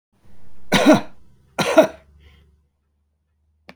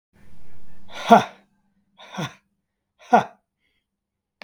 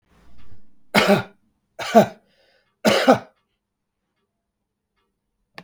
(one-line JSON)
{"cough_length": "3.8 s", "cough_amplitude": 32768, "cough_signal_mean_std_ratio": 0.36, "exhalation_length": "4.4 s", "exhalation_amplitude": 32766, "exhalation_signal_mean_std_ratio": 0.32, "three_cough_length": "5.6 s", "three_cough_amplitude": 32293, "three_cough_signal_mean_std_ratio": 0.31, "survey_phase": "beta (2021-08-13 to 2022-03-07)", "age": "45-64", "gender": "Male", "wearing_mask": "No", "symptom_cough_any": true, "smoker_status": "Never smoked", "respiratory_condition_asthma": false, "respiratory_condition_other": false, "recruitment_source": "REACT", "submission_delay": "3 days", "covid_test_result": "Negative", "covid_test_method": "RT-qPCR", "influenza_a_test_result": "Negative", "influenza_b_test_result": "Negative"}